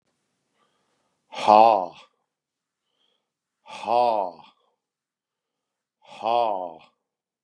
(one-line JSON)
{"exhalation_length": "7.4 s", "exhalation_amplitude": 29239, "exhalation_signal_mean_std_ratio": 0.28, "survey_phase": "beta (2021-08-13 to 2022-03-07)", "age": "65+", "gender": "Male", "wearing_mask": "No", "symptom_none": true, "symptom_onset": "12 days", "smoker_status": "Ex-smoker", "respiratory_condition_asthma": false, "respiratory_condition_other": false, "recruitment_source": "REACT", "submission_delay": "2 days", "covid_test_result": "Negative", "covid_test_method": "RT-qPCR", "influenza_a_test_result": "Negative", "influenza_b_test_result": "Negative"}